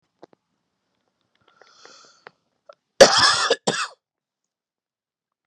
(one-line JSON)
{"cough_length": "5.5 s", "cough_amplitude": 32768, "cough_signal_mean_std_ratio": 0.24, "survey_phase": "beta (2021-08-13 to 2022-03-07)", "age": "18-44", "gender": "Male", "wearing_mask": "No", "symptom_none": true, "smoker_status": "Ex-smoker", "respiratory_condition_asthma": false, "respiratory_condition_other": false, "recruitment_source": "REACT", "submission_delay": "4 days", "covid_test_result": "Negative", "covid_test_method": "RT-qPCR"}